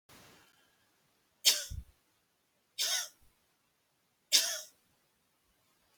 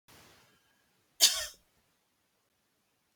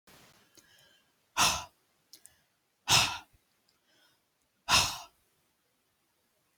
{"three_cough_length": "6.0 s", "three_cough_amplitude": 12893, "three_cough_signal_mean_std_ratio": 0.26, "cough_length": "3.2 s", "cough_amplitude": 13922, "cough_signal_mean_std_ratio": 0.19, "exhalation_length": "6.6 s", "exhalation_amplitude": 10338, "exhalation_signal_mean_std_ratio": 0.27, "survey_phase": "beta (2021-08-13 to 2022-03-07)", "age": "45-64", "gender": "Female", "wearing_mask": "No", "symptom_fatigue": true, "smoker_status": "Never smoked", "respiratory_condition_asthma": false, "respiratory_condition_other": false, "recruitment_source": "Test and Trace", "submission_delay": "2 days", "covid_test_result": "Positive", "covid_test_method": "LFT"}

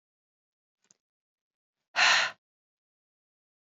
{"exhalation_length": "3.7 s", "exhalation_amplitude": 10169, "exhalation_signal_mean_std_ratio": 0.23, "survey_phase": "beta (2021-08-13 to 2022-03-07)", "age": "45-64", "gender": "Female", "wearing_mask": "No", "symptom_runny_or_blocked_nose": true, "symptom_onset": "6 days", "smoker_status": "Never smoked", "respiratory_condition_asthma": false, "respiratory_condition_other": false, "recruitment_source": "REACT", "submission_delay": "1 day", "covid_test_result": "Negative", "covid_test_method": "RT-qPCR", "influenza_a_test_result": "Negative", "influenza_b_test_result": "Negative"}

